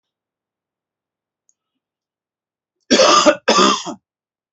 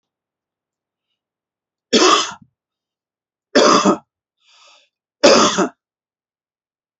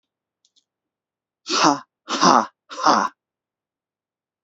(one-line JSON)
{"cough_length": "4.5 s", "cough_amplitude": 32768, "cough_signal_mean_std_ratio": 0.34, "three_cough_length": "7.0 s", "three_cough_amplitude": 31178, "three_cough_signal_mean_std_ratio": 0.33, "exhalation_length": "4.4 s", "exhalation_amplitude": 32768, "exhalation_signal_mean_std_ratio": 0.33, "survey_phase": "beta (2021-08-13 to 2022-03-07)", "age": "18-44", "gender": "Male", "wearing_mask": "No", "symptom_abdominal_pain": true, "symptom_fatigue": true, "symptom_headache": true, "symptom_onset": "5 days", "smoker_status": "Never smoked", "respiratory_condition_asthma": false, "respiratory_condition_other": false, "recruitment_source": "Test and Trace", "submission_delay": "2 days", "covid_test_result": "Positive", "covid_test_method": "RT-qPCR", "covid_ct_value": 23.6, "covid_ct_gene": "ORF1ab gene", "covid_ct_mean": 24.0, "covid_viral_load": "14000 copies/ml", "covid_viral_load_category": "Low viral load (10K-1M copies/ml)"}